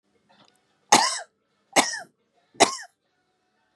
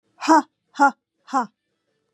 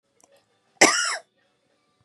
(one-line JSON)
{"three_cough_length": "3.8 s", "three_cough_amplitude": 31570, "three_cough_signal_mean_std_ratio": 0.27, "exhalation_length": "2.1 s", "exhalation_amplitude": 22477, "exhalation_signal_mean_std_ratio": 0.33, "cough_length": "2.0 s", "cough_amplitude": 29793, "cough_signal_mean_std_ratio": 0.28, "survey_phase": "beta (2021-08-13 to 2022-03-07)", "age": "45-64", "gender": "Female", "wearing_mask": "No", "symptom_runny_or_blocked_nose": true, "smoker_status": "Never smoked", "respiratory_condition_asthma": false, "respiratory_condition_other": false, "recruitment_source": "Test and Trace", "submission_delay": "1 day", "covid_test_result": "Positive", "covid_test_method": "RT-qPCR", "covid_ct_value": 21.0, "covid_ct_gene": "ORF1ab gene", "covid_ct_mean": 21.1, "covid_viral_load": "120000 copies/ml", "covid_viral_load_category": "Low viral load (10K-1M copies/ml)"}